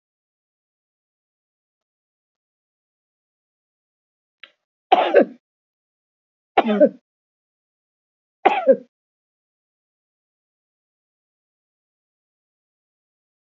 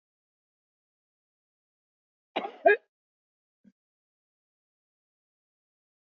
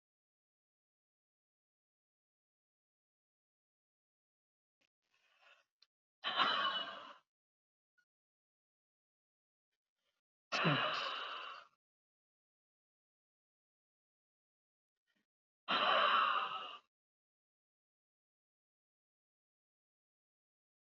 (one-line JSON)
{"three_cough_length": "13.5 s", "three_cough_amplitude": 32258, "three_cough_signal_mean_std_ratio": 0.18, "cough_length": "6.1 s", "cough_amplitude": 11787, "cough_signal_mean_std_ratio": 0.13, "exhalation_length": "20.9 s", "exhalation_amplitude": 3429, "exhalation_signal_mean_std_ratio": 0.27, "survey_phase": "beta (2021-08-13 to 2022-03-07)", "age": "65+", "gender": "Female", "wearing_mask": "No", "symptom_runny_or_blocked_nose": true, "smoker_status": "Ex-smoker", "respiratory_condition_asthma": false, "respiratory_condition_other": false, "recruitment_source": "REACT", "submission_delay": "1 day", "covid_test_result": "Negative", "covid_test_method": "RT-qPCR"}